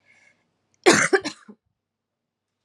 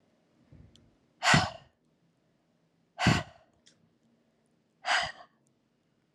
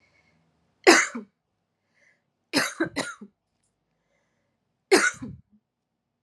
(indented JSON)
{
  "cough_length": "2.6 s",
  "cough_amplitude": 29341,
  "cough_signal_mean_std_ratio": 0.27,
  "exhalation_length": "6.1 s",
  "exhalation_amplitude": 12665,
  "exhalation_signal_mean_std_ratio": 0.27,
  "three_cough_length": "6.2 s",
  "three_cough_amplitude": 30959,
  "three_cough_signal_mean_std_ratio": 0.26,
  "survey_phase": "alpha (2021-03-01 to 2021-08-12)",
  "age": "18-44",
  "gender": "Female",
  "wearing_mask": "No",
  "symptom_shortness_of_breath": true,
  "symptom_abdominal_pain": true,
  "symptom_diarrhoea": true,
  "symptom_fatigue": true,
  "symptom_headache": true,
  "symptom_change_to_sense_of_smell_or_taste": true,
  "symptom_onset": "4 days",
  "smoker_status": "Never smoked",
  "respiratory_condition_asthma": false,
  "respiratory_condition_other": false,
  "recruitment_source": "Test and Trace",
  "submission_delay": "2 days",
  "covid_test_result": "Positive",
  "covid_test_method": "RT-qPCR"
}